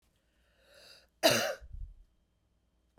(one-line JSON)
{"cough_length": "3.0 s", "cough_amplitude": 9306, "cough_signal_mean_std_ratio": 0.28, "survey_phase": "beta (2021-08-13 to 2022-03-07)", "age": "45-64", "gender": "Female", "wearing_mask": "No", "symptom_runny_or_blocked_nose": true, "symptom_sore_throat": true, "symptom_fatigue": true, "smoker_status": "Never smoked", "respiratory_condition_asthma": true, "respiratory_condition_other": false, "recruitment_source": "Test and Trace", "submission_delay": "2 days", "covid_test_result": "Positive", "covid_test_method": "RT-qPCR", "covid_ct_value": 18.9, "covid_ct_gene": "ORF1ab gene", "covid_ct_mean": 19.5, "covid_viral_load": "390000 copies/ml", "covid_viral_load_category": "Low viral load (10K-1M copies/ml)"}